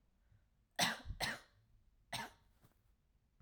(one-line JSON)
{"cough_length": "3.4 s", "cough_amplitude": 2600, "cough_signal_mean_std_ratio": 0.34, "survey_phase": "alpha (2021-03-01 to 2021-08-12)", "age": "18-44", "gender": "Female", "wearing_mask": "No", "symptom_none": true, "smoker_status": "Never smoked", "respiratory_condition_asthma": false, "respiratory_condition_other": false, "recruitment_source": "REACT", "submission_delay": "1 day", "covid_test_result": "Negative", "covid_test_method": "RT-qPCR"}